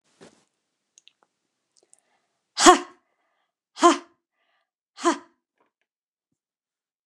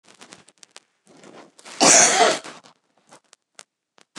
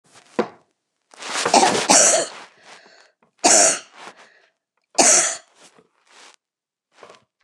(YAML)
exhalation_length: 7.1 s
exhalation_amplitude: 29203
exhalation_signal_mean_std_ratio: 0.18
cough_length: 4.2 s
cough_amplitude: 29203
cough_signal_mean_std_ratio: 0.31
three_cough_length: 7.4 s
three_cough_amplitude: 29204
three_cough_signal_mean_std_ratio: 0.38
survey_phase: beta (2021-08-13 to 2022-03-07)
age: 65+
gender: Female
wearing_mask: 'No'
symptom_none: true
smoker_status: Never smoked
respiratory_condition_asthma: false
respiratory_condition_other: false
recruitment_source: REACT
submission_delay: 2 days
covid_test_result: Negative
covid_test_method: RT-qPCR